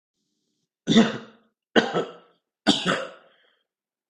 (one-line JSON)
{"three_cough_length": "4.1 s", "three_cough_amplitude": 26913, "three_cough_signal_mean_std_ratio": 0.34, "survey_phase": "beta (2021-08-13 to 2022-03-07)", "age": "18-44", "gender": "Male", "wearing_mask": "No", "symptom_cough_any": true, "symptom_sore_throat": true, "symptom_diarrhoea": true, "symptom_onset": "8 days", "smoker_status": "Ex-smoker", "respiratory_condition_asthma": false, "respiratory_condition_other": false, "recruitment_source": "REACT", "submission_delay": "0 days", "covid_test_result": "Negative", "covid_test_method": "RT-qPCR", "influenza_a_test_result": "Negative", "influenza_b_test_result": "Negative"}